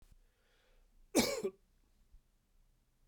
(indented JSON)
{
  "cough_length": "3.1 s",
  "cough_amplitude": 5452,
  "cough_signal_mean_std_ratio": 0.27,
  "survey_phase": "beta (2021-08-13 to 2022-03-07)",
  "age": "45-64",
  "gender": "Male",
  "wearing_mask": "No",
  "symptom_none": true,
  "smoker_status": "Never smoked",
  "respiratory_condition_asthma": true,
  "respiratory_condition_other": false,
  "recruitment_source": "REACT",
  "submission_delay": "1 day",
  "covid_test_result": "Negative",
  "covid_test_method": "RT-qPCR"
}